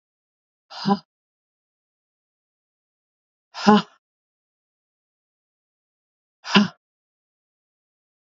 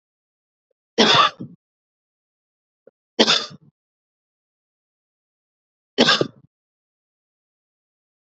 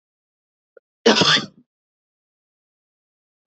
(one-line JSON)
{"exhalation_length": "8.3 s", "exhalation_amplitude": 26310, "exhalation_signal_mean_std_ratio": 0.19, "three_cough_length": "8.4 s", "three_cough_amplitude": 32767, "three_cough_signal_mean_std_ratio": 0.24, "cough_length": "3.5 s", "cough_amplitude": 30959, "cough_signal_mean_std_ratio": 0.25, "survey_phase": "beta (2021-08-13 to 2022-03-07)", "age": "45-64", "gender": "Female", "wearing_mask": "No", "symptom_runny_or_blocked_nose": true, "symptom_sore_throat": true, "symptom_headache": true, "symptom_change_to_sense_of_smell_or_taste": true, "smoker_status": "Never smoked", "respiratory_condition_asthma": false, "respiratory_condition_other": false, "recruitment_source": "Test and Trace", "submission_delay": "0 days", "covid_test_result": "Positive", "covid_test_method": "LFT"}